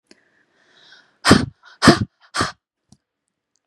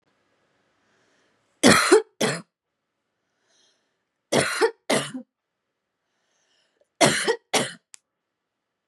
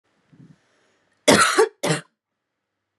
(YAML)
exhalation_length: 3.7 s
exhalation_amplitude: 32768
exhalation_signal_mean_std_ratio: 0.26
three_cough_length: 8.9 s
three_cough_amplitude: 29098
three_cough_signal_mean_std_ratio: 0.31
cough_length: 3.0 s
cough_amplitude: 30211
cough_signal_mean_std_ratio: 0.32
survey_phase: beta (2021-08-13 to 2022-03-07)
age: 18-44
gender: Female
wearing_mask: 'No'
symptom_new_continuous_cough: true
symptom_runny_or_blocked_nose: true
symptom_sore_throat: true
symptom_fatigue: true
symptom_headache: true
symptom_onset: 4 days
smoker_status: Never smoked
respiratory_condition_asthma: false
respiratory_condition_other: false
recruitment_source: Test and Trace
submission_delay: 2 days
covid_test_result: Positive
covid_test_method: RT-qPCR
covid_ct_value: 18.9
covid_ct_gene: ORF1ab gene
covid_ct_mean: 19.4
covid_viral_load: 430000 copies/ml
covid_viral_load_category: Low viral load (10K-1M copies/ml)